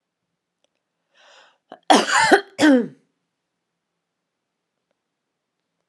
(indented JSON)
{
  "cough_length": "5.9 s",
  "cough_amplitude": 32337,
  "cough_signal_mean_std_ratio": 0.27,
  "survey_phase": "alpha (2021-03-01 to 2021-08-12)",
  "age": "18-44",
  "gender": "Female",
  "wearing_mask": "No",
  "symptom_none": true,
  "smoker_status": "Never smoked",
  "respiratory_condition_asthma": false,
  "respiratory_condition_other": false,
  "recruitment_source": "REACT",
  "submission_delay": "2 days",
  "covid_test_result": "Negative",
  "covid_test_method": "RT-qPCR",
  "covid_ct_value": 39.0,
  "covid_ct_gene": "N gene"
}